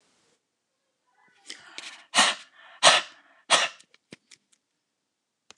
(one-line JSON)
{"exhalation_length": "5.6 s", "exhalation_amplitude": 26885, "exhalation_signal_mean_std_ratio": 0.25, "survey_phase": "alpha (2021-03-01 to 2021-08-12)", "age": "45-64", "gender": "Male", "wearing_mask": "No", "symptom_none": true, "smoker_status": "Ex-smoker", "respiratory_condition_asthma": false, "respiratory_condition_other": false, "recruitment_source": "REACT", "submission_delay": "1 day", "covid_test_result": "Negative", "covid_test_method": "RT-qPCR"}